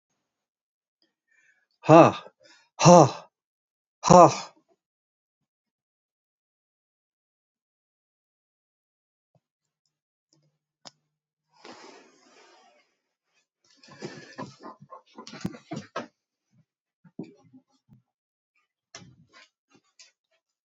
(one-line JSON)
{"exhalation_length": "20.7 s", "exhalation_amplitude": 30087, "exhalation_signal_mean_std_ratio": 0.16, "survey_phase": "alpha (2021-03-01 to 2021-08-12)", "age": "65+", "gender": "Male", "wearing_mask": "No", "symptom_none": true, "smoker_status": "Never smoked", "respiratory_condition_asthma": false, "respiratory_condition_other": false, "recruitment_source": "REACT", "submission_delay": "2 days", "covid_test_result": "Negative", "covid_test_method": "RT-qPCR"}